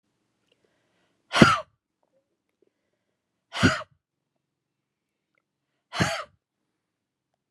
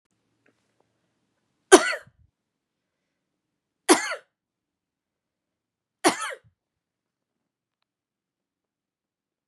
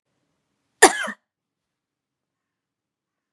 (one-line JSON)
{"exhalation_length": "7.5 s", "exhalation_amplitude": 32768, "exhalation_signal_mean_std_ratio": 0.2, "three_cough_length": "9.5 s", "three_cough_amplitude": 32767, "three_cough_signal_mean_std_ratio": 0.15, "cough_length": "3.3 s", "cough_amplitude": 32767, "cough_signal_mean_std_ratio": 0.15, "survey_phase": "beta (2021-08-13 to 2022-03-07)", "age": "45-64", "gender": "Female", "wearing_mask": "No", "symptom_cough_any": true, "symptom_runny_or_blocked_nose": true, "symptom_fatigue": true, "symptom_change_to_sense_of_smell_or_taste": true, "symptom_loss_of_taste": true, "symptom_onset": "3 days", "smoker_status": "Never smoked", "respiratory_condition_asthma": false, "respiratory_condition_other": false, "recruitment_source": "Test and Trace", "submission_delay": "1 day", "covid_test_result": "Positive", "covid_test_method": "RT-qPCR"}